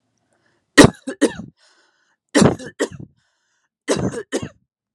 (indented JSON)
{
  "three_cough_length": "4.9 s",
  "three_cough_amplitude": 32768,
  "three_cough_signal_mean_std_ratio": 0.29,
  "survey_phase": "beta (2021-08-13 to 2022-03-07)",
  "age": "18-44",
  "gender": "Female",
  "wearing_mask": "No",
  "symptom_cough_any": true,
  "symptom_new_continuous_cough": true,
  "symptom_sore_throat": true,
  "symptom_change_to_sense_of_smell_or_taste": true,
  "symptom_loss_of_taste": true,
  "symptom_onset": "3 days",
  "smoker_status": "Never smoked",
  "respiratory_condition_asthma": false,
  "respiratory_condition_other": false,
  "recruitment_source": "Test and Trace",
  "submission_delay": "2 days",
  "covid_test_result": "Positive",
  "covid_test_method": "RT-qPCR",
  "covid_ct_value": 22.7,
  "covid_ct_gene": "ORF1ab gene",
  "covid_ct_mean": 23.2,
  "covid_viral_load": "24000 copies/ml",
  "covid_viral_load_category": "Low viral load (10K-1M copies/ml)"
}